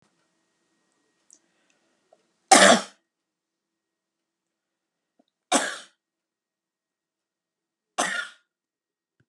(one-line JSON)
{"three_cough_length": "9.3 s", "three_cough_amplitude": 30783, "three_cough_signal_mean_std_ratio": 0.19, "survey_phase": "beta (2021-08-13 to 2022-03-07)", "age": "65+", "gender": "Female", "wearing_mask": "No", "symptom_none": true, "smoker_status": "Never smoked", "respiratory_condition_asthma": false, "respiratory_condition_other": false, "recruitment_source": "REACT", "submission_delay": "2 days", "covid_test_result": "Negative", "covid_test_method": "RT-qPCR", "influenza_a_test_result": "Negative", "influenza_b_test_result": "Negative"}